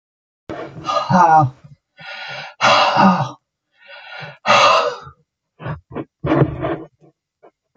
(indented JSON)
{
  "exhalation_length": "7.8 s",
  "exhalation_amplitude": 28732,
  "exhalation_signal_mean_std_ratio": 0.49,
  "survey_phase": "alpha (2021-03-01 to 2021-08-12)",
  "age": "65+",
  "gender": "Male",
  "wearing_mask": "No",
  "symptom_none": true,
  "smoker_status": "Never smoked",
  "respiratory_condition_asthma": false,
  "respiratory_condition_other": false,
  "recruitment_source": "REACT",
  "submission_delay": "2 days",
  "covid_test_result": "Negative",
  "covid_test_method": "RT-qPCR"
}